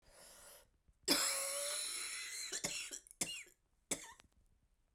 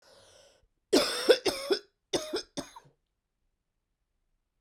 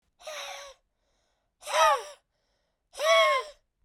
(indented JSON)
{
  "three_cough_length": "4.9 s",
  "three_cough_amplitude": 4031,
  "three_cough_signal_mean_std_ratio": 0.54,
  "cough_length": "4.6 s",
  "cough_amplitude": 14300,
  "cough_signal_mean_std_ratio": 0.31,
  "exhalation_length": "3.8 s",
  "exhalation_amplitude": 10562,
  "exhalation_signal_mean_std_ratio": 0.4,
  "survey_phase": "beta (2021-08-13 to 2022-03-07)",
  "age": "45-64",
  "gender": "Female",
  "wearing_mask": "No",
  "symptom_cough_any": true,
  "symptom_runny_or_blocked_nose": true,
  "symptom_diarrhoea": true,
  "symptom_fatigue": true,
  "symptom_change_to_sense_of_smell_or_taste": true,
  "symptom_onset": "10 days",
  "smoker_status": "Ex-smoker",
  "respiratory_condition_asthma": true,
  "respiratory_condition_other": false,
  "recruitment_source": "Test and Trace",
  "submission_delay": "2 days",
  "covid_test_result": "Positive",
  "covid_test_method": "RT-qPCR"
}